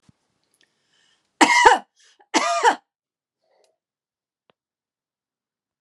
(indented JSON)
{
  "cough_length": "5.8 s",
  "cough_amplitude": 32767,
  "cough_signal_mean_std_ratio": 0.26,
  "survey_phase": "alpha (2021-03-01 to 2021-08-12)",
  "age": "45-64",
  "gender": "Female",
  "wearing_mask": "No",
  "symptom_headache": true,
  "smoker_status": "Ex-smoker",
  "respiratory_condition_asthma": true,
  "respiratory_condition_other": false,
  "recruitment_source": "REACT",
  "submission_delay": "2 days",
  "covid_test_result": "Negative",
  "covid_test_method": "RT-qPCR"
}